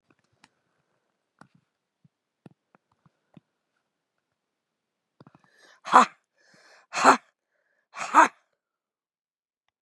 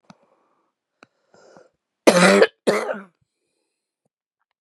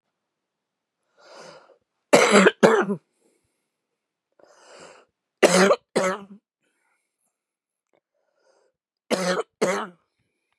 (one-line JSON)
{"exhalation_length": "9.8 s", "exhalation_amplitude": 30849, "exhalation_signal_mean_std_ratio": 0.17, "cough_length": "4.6 s", "cough_amplitude": 32306, "cough_signal_mean_std_ratio": 0.28, "three_cough_length": "10.6 s", "three_cough_amplitude": 30238, "three_cough_signal_mean_std_ratio": 0.3, "survey_phase": "beta (2021-08-13 to 2022-03-07)", "age": "65+", "gender": "Female", "wearing_mask": "No", "symptom_cough_any": true, "symptom_runny_or_blocked_nose": true, "symptom_sore_throat": true, "symptom_headache": true, "symptom_onset": "2 days", "smoker_status": "Never smoked", "respiratory_condition_asthma": false, "respiratory_condition_other": false, "recruitment_source": "REACT", "submission_delay": "9 days", "covid_test_result": "Negative", "covid_test_method": "RT-qPCR", "influenza_a_test_result": "Negative", "influenza_b_test_result": "Negative"}